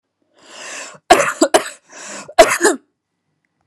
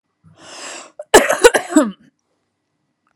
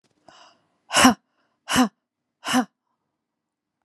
{"three_cough_length": "3.7 s", "three_cough_amplitude": 32768, "three_cough_signal_mean_std_ratio": 0.35, "cough_length": "3.2 s", "cough_amplitude": 32768, "cough_signal_mean_std_ratio": 0.31, "exhalation_length": "3.8 s", "exhalation_amplitude": 31454, "exhalation_signal_mean_std_ratio": 0.29, "survey_phase": "alpha (2021-03-01 to 2021-08-12)", "age": "18-44", "gender": "Female", "wearing_mask": "No", "symptom_none": true, "smoker_status": "Never smoked", "respiratory_condition_asthma": false, "respiratory_condition_other": false, "recruitment_source": "REACT", "submission_delay": "2 days", "covid_test_result": "Negative", "covid_test_method": "RT-qPCR"}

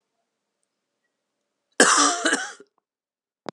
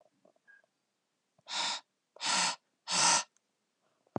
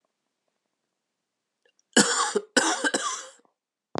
{"cough_length": "3.5 s", "cough_amplitude": 32550, "cough_signal_mean_std_ratio": 0.31, "exhalation_length": "4.2 s", "exhalation_amplitude": 6038, "exhalation_signal_mean_std_ratio": 0.38, "three_cough_length": "4.0 s", "three_cough_amplitude": 22481, "three_cough_signal_mean_std_ratio": 0.36, "survey_phase": "alpha (2021-03-01 to 2021-08-12)", "age": "18-44", "gender": "Male", "wearing_mask": "No", "symptom_cough_any": true, "symptom_shortness_of_breath": true, "symptom_abdominal_pain": true, "symptom_fatigue": true, "symptom_fever_high_temperature": true, "symptom_headache": true, "smoker_status": "Never smoked", "respiratory_condition_asthma": false, "respiratory_condition_other": false, "recruitment_source": "Test and Trace", "submission_delay": "2 days", "covid_test_result": "Positive", "covid_test_method": "RT-qPCR", "covid_ct_value": 24.5, "covid_ct_gene": "ORF1ab gene", "covid_ct_mean": 24.8, "covid_viral_load": "7100 copies/ml", "covid_viral_load_category": "Minimal viral load (< 10K copies/ml)"}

